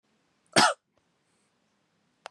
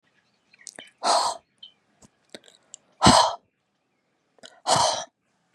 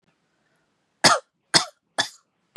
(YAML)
cough_length: 2.3 s
cough_amplitude: 22109
cough_signal_mean_std_ratio: 0.21
exhalation_length: 5.5 s
exhalation_amplitude: 27277
exhalation_signal_mean_std_ratio: 0.32
three_cough_length: 2.6 s
three_cough_amplitude: 31280
three_cough_signal_mean_std_ratio: 0.25
survey_phase: beta (2021-08-13 to 2022-03-07)
age: 18-44
gender: Female
wearing_mask: 'No'
symptom_none: true
smoker_status: Never smoked
respiratory_condition_asthma: false
respiratory_condition_other: false
recruitment_source: Test and Trace
submission_delay: 2 days
covid_test_result: Positive
covid_test_method: ePCR